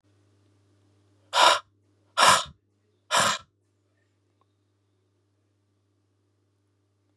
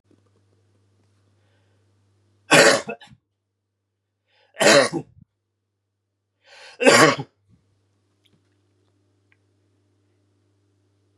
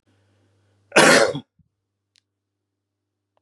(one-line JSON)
{"exhalation_length": "7.2 s", "exhalation_amplitude": 21206, "exhalation_signal_mean_std_ratio": 0.25, "three_cough_length": "11.2 s", "three_cough_amplitude": 32580, "three_cough_signal_mean_std_ratio": 0.24, "cough_length": "3.4 s", "cough_amplitude": 30633, "cough_signal_mean_std_ratio": 0.26, "survey_phase": "beta (2021-08-13 to 2022-03-07)", "age": "45-64", "gender": "Male", "wearing_mask": "No", "symptom_runny_or_blocked_nose": true, "smoker_status": "Never smoked", "respiratory_condition_asthma": false, "respiratory_condition_other": false, "recruitment_source": "Test and Trace", "submission_delay": "2 days", "covid_test_result": "Positive", "covid_test_method": "ePCR"}